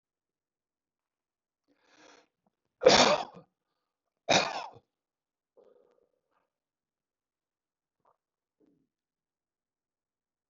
{"cough_length": "10.5 s", "cough_amplitude": 16295, "cough_signal_mean_std_ratio": 0.18, "survey_phase": "beta (2021-08-13 to 2022-03-07)", "age": "65+", "gender": "Male", "wearing_mask": "No", "symptom_none": true, "smoker_status": "Never smoked", "respiratory_condition_asthma": false, "respiratory_condition_other": false, "recruitment_source": "REACT", "submission_delay": "2 days", "covid_test_result": "Negative", "covid_test_method": "RT-qPCR", "influenza_a_test_result": "Negative", "influenza_b_test_result": "Negative"}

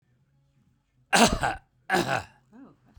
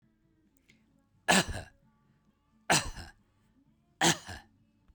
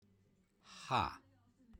{"cough_length": "3.0 s", "cough_amplitude": 22338, "cough_signal_mean_std_ratio": 0.36, "three_cough_length": "4.9 s", "three_cough_amplitude": 12952, "three_cough_signal_mean_std_ratio": 0.28, "exhalation_length": "1.8 s", "exhalation_amplitude": 2871, "exhalation_signal_mean_std_ratio": 0.33, "survey_phase": "beta (2021-08-13 to 2022-03-07)", "age": "65+", "gender": "Female", "wearing_mask": "No", "symptom_none": true, "smoker_status": "Never smoked", "respiratory_condition_asthma": false, "respiratory_condition_other": false, "recruitment_source": "Test and Trace", "submission_delay": "1 day", "covid_test_result": "Negative", "covid_test_method": "RT-qPCR"}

